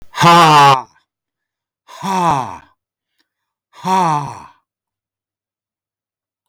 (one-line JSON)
{"exhalation_length": "6.5 s", "exhalation_amplitude": 32165, "exhalation_signal_mean_std_ratio": 0.4, "survey_phase": "alpha (2021-03-01 to 2021-08-12)", "age": "65+", "gender": "Male", "wearing_mask": "No", "symptom_none": true, "smoker_status": "Never smoked", "respiratory_condition_asthma": false, "respiratory_condition_other": false, "recruitment_source": "REACT", "submission_delay": "1 day", "covid_test_result": "Negative", "covid_test_method": "RT-qPCR"}